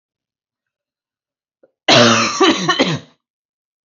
{
  "cough_length": "3.8 s",
  "cough_amplitude": 30657,
  "cough_signal_mean_std_ratio": 0.41,
  "survey_phase": "alpha (2021-03-01 to 2021-08-12)",
  "age": "18-44",
  "gender": "Female",
  "wearing_mask": "No",
  "symptom_none": true,
  "smoker_status": "Never smoked",
  "respiratory_condition_asthma": false,
  "respiratory_condition_other": false,
  "recruitment_source": "REACT",
  "submission_delay": "2 days",
  "covid_test_result": "Negative",
  "covid_test_method": "RT-qPCR"
}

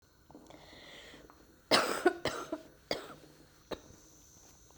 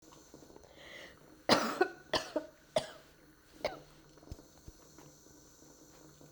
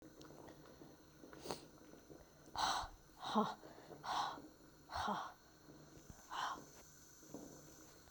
{
  "cough_length": "4.8 s",
  "cough_amplitude": 8523,
  "cough_signal_mean_std_ratio": 0.34,
  "three_cough_length": "6.3 s",
  "three_cough_amplitude": 10090,
  "three_cough_signal_mean_std_ratio": 0.32,
  "exhalation_length": "8.1 s",
  "exhalation_amplitude": 2522,
  "exhalation_signal_mean_std_ratio": 0.52,
  "survey_phase": "beta (2021-08-13 to 2022-03-07)",
  "age": "45-64",
  "gender": "Female",
  "wearing_mask": "No",
  "symptom_cough_any": true,
  "symptom_new_continuous_cough": true,
  "symptom_runny_or_blocked_nose": true,
  "symptom_sore_throat": true,
  "symptom_abdominal_pain": true,
  "symptom_fatigue": true,
  "symptom_fever_high_temperature": true,
  "symptom_headache": true,
  "symptom_change_to_sense_of_smell_or_taste": true,
  "symptom_onset": "3 days",
  "smoker_status": "Never smoked",
  "respiratory_condition_asthma": false,
  "respiratory_condition_other": false,
  "recruitment_source": "Test and Trace",
  "submission_delay": "2 days",
  "covid_test_result": "Positive",
  "covid_test_method": "RT-qPCR"
}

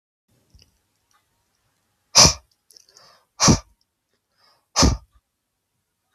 {
  "exhalation_length": "6.1 s",
  "exhalation_amplitude": 32768,
  "exhalation_signal_mean_std_ratio": 0.23,
  "survey_phase": "beta (2021-08-13 to 2022-03-07)",
  "age": "18-44",
  "gender": "Male",
  "wearing_mask": "No",
  "symptom_none": true,
  "smoker_status": "Never smoked",
  "respiratory_condition_asthma": false,
  "respiratory_condition_other": false,
  "recruitment_source": "REACT",
  "submission_delay": "1 day",
  "covid_test_result": "Negative",
  "covid_test_method": "RT-qPCR",
  "influenza_a_test_result": "Negative",
  "influenza_b_test_result": "Negative"
}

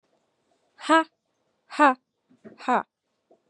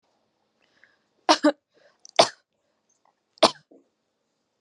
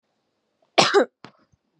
{
  "exhalation_length": "3.5 s",
  "exhalation_amplitude": 18622,
  "exhalation_signal_mean_std_ratio": 0.28,
  "three_cough_length": "4.6 s",
  "three_cough_amplitude": 29450,
  "three_cough_signal_mean_std_ratio": 0.19,
  "cough_length": "1.8 s",
  "cough_amplitude": 29969,
  "cough_signal_mean_std_ratio": 0.29,
  "survey_phase": "beta (2021-08-13 to 2022-03-07)",
  "age": "18-44",
  "gender": "Female",
  "wearing_mask": "No",
  "symptom_none": true,
  "smoker_status": "Never smoked",
  "respiratory_condition_asthma": false,
  "respiratory_condition_other": false,
  "recruitment_source": "REACT",
  "submission_delay": "1 day",
  "covid_test_result": "Negative",
  "covid_test_method": "RT-qPCR"
}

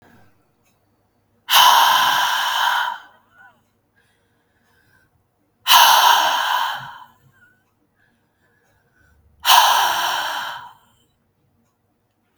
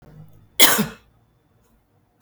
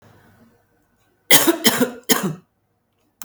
{
  "exhalation_length": "12.4 s",
  "exhalation_amplitude": 32768,
  "exhalation_signal_mean_std_ratio": 0.42,
  "cough_length": "2.2 s",
  "cough_amplitude": 32768,
  "cough_signal_mean_std_ratio": 0.26,
  "three_cough_length": "3.2 s",
  "three_cough_amplitude": 32768,
  "three_cough_signal_mean_std_ratio": 0.34,
  "survey_phase": "beta (2021-08-13 to 2022-03-07)",
  "age": "45-64",
  "gender": "Female",
  "wearing_mask": "No",
  "symptom_none": true,
  "symptom_onset": "3 days",
  "smoker_status": "Current smoker (11 or more cigarettes per day)",
  "respiratory_condition_asthma": false,
  "respiratory_condition_other": false,
  "recruitment_source": "REACT",
  "submission_delay": "3 days",
  "covid_test_result": "Negative",
  "covid_test_method": "RT-qPCR",
  "influenza_a_test_result": "Negative",
  "influenza_b_test_result": "Negative"
}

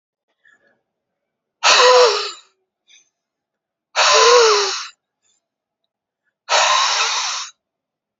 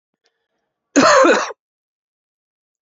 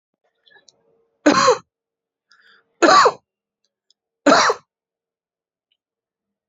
{
  "exhalation_length": "8.2 s",
  "exhalation_amplitude": 31383,
  "exhalation_signal_mean_std_ratio": 0.44,
  "cough_length": "2.8 s",
  "cough_amplitude": 29785,
  "cough_signal_mean_std_ratio": 0.35,
  "three_cough_length": "6.5 s",
  "three_cough_amplitude": 28827,
  "three_cough_signal_mean_std_ratio": 0.3,
  "survey_phase": "beta (2021-08-13 to 2022-03-07)",
  "age": "18-44",
  "gender": "Male",
  "wearing_mask": "No",
  "symptom_cough_any": true,
  "symptom_shortness_of_breath": true,
  "symptom_onset": "3 days",
  "smoker_status": "Never smoked",
  "respiratory_condition_asthma": false,
  "respiratory_condition_other": false,
  "recruitment_source": "Test and Trace",
  "submission_delay": "1 day",
  "covid_test_result": "Positive",
  "covid_test_method": "RT-qPCR",
  "covid_ct_value": 25.2,
  "covid_ct_gene": "ORF1ab gene",
  "covid_ct_mean": 25.9,
  "covid_viral_load": "3200 copies/ml",
  "covid_viral_load_category": "Minimal viral load (< 10K copies/ml)"
}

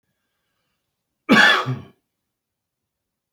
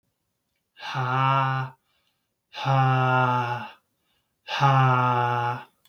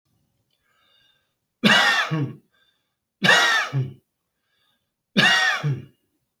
{
  "cough_length": "3.3 s",
  "cough_amplitude": 27262,
  "cough_signal_mean_std_ratio": 0.28,
  "exhalation_length": "5.9 s",
  "exhalation_amplitude": 14875,
  "exhalation_signal_mean_std_ratio": 0.62,
  "three_cough_length": "6.4 s",
  "three_cough_amplitude": 24029,
  "three_cough_signal_mean_std_ratio": 0.44,
  "survey_phase": "beta (2021-08-13 to 2022-03-07)",
  "age": "18-44",
  "gender": "Male",
  "wearing_mask": "No",
  "symptom_none": true,
  "smoker_status": "Never smoked",
  "respiratory_condition_asthma": false,
  "respiratory_condition_other": false,
  "recruitment_source": "REACT",
  "submission_delay": "1 day",
  "covid_test_result": "Negative",
  "covid_test_method": "RT-qPCR",
  "influenza_a_test_result": "Negative",
  "influenza_b_test_result": "Negative"
}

